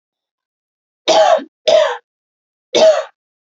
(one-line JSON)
{"three_cough_length": "3.5 s", "three_cough_amplitude": 30944, "three_cough_signal_mean_std_ratio": 0.43, "survey_phase": "beta (2021-08-13 to 2022-03-07)", "age": "18-44", "gender": "Female", "wearing_mask": "No", "symptom_none": true, "smoker_status": "Ex-smoker", "respiratory_condition_asthma": false, "respiratory_condition_other": false, "recruitment_source": "REACT", "submission_delay": "1 day", "covid_test_result": "Negative", "covid_test_method": "RT-qPCR"}